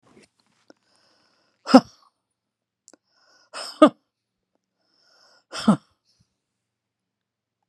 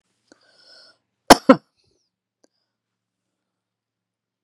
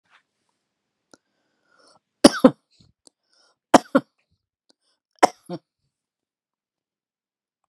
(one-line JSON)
{"exhalation_length": "7.7 s", "exhalation_amplitude": 32767, "exhalation_signal_mean_std_ratio": 0.15, "cough_length": "4.4 s", "cough_amplitude": 32768, "cough_signal_mean_std_ratio": 0.12, "three_cough_length": "7.7 s", "three_cough_amplitude": 32768, "three_cough_signal_mean_std_ratio": 0.13, "survey_phase": "beta (2021-08-13 to 2022-03-07)", "age": "45-64", "gender": "Female", "wearing_mask": "No", "symptom_runny_or_blocked_nose": true, "symptom_shortness_of_breath": true, "symptom_onset": "6 days", "smoker_status": "Ex-smoker", "respiratory_condition_asthma": false, "respiratory_condition_other": false, "recruitment_source": "REACT", "submission_delay": "2 days", "covid_test_result": "Negative", "covid_test_method": "RT-qPCR"}